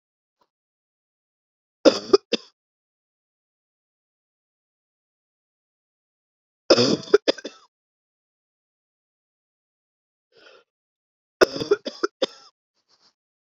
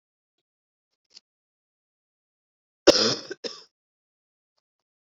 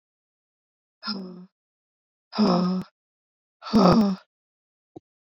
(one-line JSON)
{"three_cough_length": "13.6 s", "three_cough_amplitude": 29466, "three_cough_signal_mean_std_ratio": 0.17, "cough_length": "5.0 s", "cough_amplitude": 27501, "cough_signal_mean_std_ratio": 0.17, "exhalation_length": "5.4 s", "exhalation_amplitude": 24008, "exhalation_signal_mean_std_ratio": 0.37, "survey_phase": "beta (2021-08-13 to 2022-03-07)", "age": "45-64", "gender": "Female", "wearing_mask": "No", "symptom_cough_any": true, "symptom_runny_or_blocked_nose": true, "symptom_shortness_of_breath": true, "symptom_abdominal_pain": true, "symptom_fatigue": true, "symptom_fever_high_temperature": true, "symptom_headache": true, "symptom_onset": "2 days", "smoker_status": "Never smoked", "respiratory_condition_asthma": false, "respiratory_condition_other": false, "recruitment_source": "Test and Trace", "submission_delay": "2 days", "covid_test_result": "Positive", "covid_test_method": "RT-qPCR"}